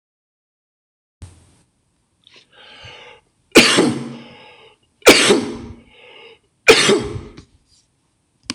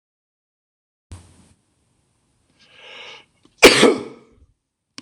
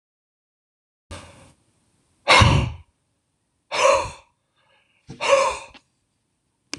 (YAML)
three_cough_length: 8.5 s
three_cough_amplitude: 26028
three_cough_signal_mean_std_ratio: 0.32
cough_length: 5.0 s
cough_amplitude: 26028
cough_signal_mean_std_ratio: 0.21
exhalation_length: 6.8 s
exhalation_amplitude: 25729
exhalation_signal_mean_std_ratio: 0.32
survey_phase: beta (2021-08-13 to 2022-03-07)
age: 45-64
gender: Male
wearing_mask: 'No'
symptom_none: true
smoker_status: Never smoked
respiratory_condition_asthma: false
respiratory_condition_other: false
recruitment_source: REACT
submission_delay: 2 days
covid_test_result: Negative
covid_test_method: RT-qPCR